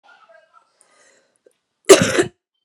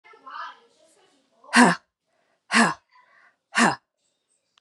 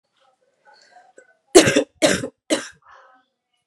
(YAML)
cough_length: 2.6 s
cough_amplitude: 32768
cough_signal_mean_std_ratio: 0.24
exhalation_length: 4.6 s
exhalation_amplitude: 27308
exhalation_signal_mean_std_ratio: 0.29
three_cough_length: 3.7 s
three_cough_amplitude: 32768
three_cough_signal_mean_std_ratio: 0.28
survey_phase: beta (2021-08-13 to 2022-03-07)
age: 18-44
gender: Female
wearing_mask: 'No'
symptom_cough_any: true
symptom_runny_or_blocked_nose: true
symptom_sore_throat: true
symptom_abdominal_pain: true
symptom_diarrhoea: true
symptom_fatigue: true
symptom_headache: true
symptom_change_to_sense_of_smell_or_taste: true
symptom_onset: 6 days
smoker_status: Ex-smoker
respiratory_condition_asthma: true
respiratory_condition_other: false
recruitment_source: Test and Trace
submission_delay: 2 days
covid_test_result: Positive
covid_test_method: RT-qPCR
covid_ct_value: 18.2
covid_ct_gene: ORF1ab gene
covid_ct_mean: 18.6
covid_viral_load: 770000 copies/ml
covid_viral_load_category: Low viral load (10K-1M copies/ml)